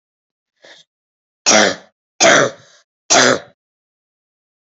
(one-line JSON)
{"three_cough_length": "4.8 s", "three_cough_amplitude": 32092, "three_cough_signal_mean_std_ratio": 0.34, "survey_phase": "beta (2021-08-13 to 2022-03-07)", "age": "18-44", "gender": "Female", "wearing_mask": "No", "symptom_cough_any": true, "symptom_sore_throat": true, "symptom_fatigue": true, "symptom_fever_high_temperature": true, "symptom_other": true, "symptom_onset": "3 days", "smoker_status": "Never smoked", "respiratory_condition_asthma": false, "respiratory_condition_other": false, "recruitment_source": "Test and Trace", "submission_delay": "2 days", "covid_test_result": "Positive", "covid_test_method": "RT-qPCR", "covid_ct_value": 17.5, "covid_ct_gene": "ORF1ab gene", "covid_ct_mean": 17.9, "covid_viral_load": "1400000 copies/ml", "covid_viral_load_category": "High viral load (>1M copies/ml)"}